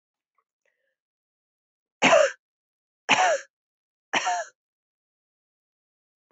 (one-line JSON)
{"three_cough_length": "6.3 s", "three_cough_amplitude": 21544, "three_cough_signal_mean_std_ratio": 0.28, "survey_phase": "beta (2021-08-13 to 2022-03-07)", "age": "45-64", "gender": "Female", "wearing_mask": "No", "symptom_cough_any": true, "symptom_runny_or_blocked_nose": true, "symptom_sore_throat": true, "symptom_fatigue": true, "symptom_fever_high_temperature": true, "symptom_other": true, "symptom_onset": "4 days", "smoker_status": "Never smoked", "respiratory_condition_asthma": false, "respiratory_condition_other": false, "recruitment_source": "Test and Trace", "submission_delay": "2 days", "covid_test_result": "Positive", "covid_test_method": "RT-qPCR", "covid_ct_value": 16.9, "covid_ct_gene": "ORF1ab gene", "covid_ct_mean": 17.4, "covid_viral_load": "1900000 copies/ml", "covid_viral_load_category": "High viral load (>1M copies/ml)"}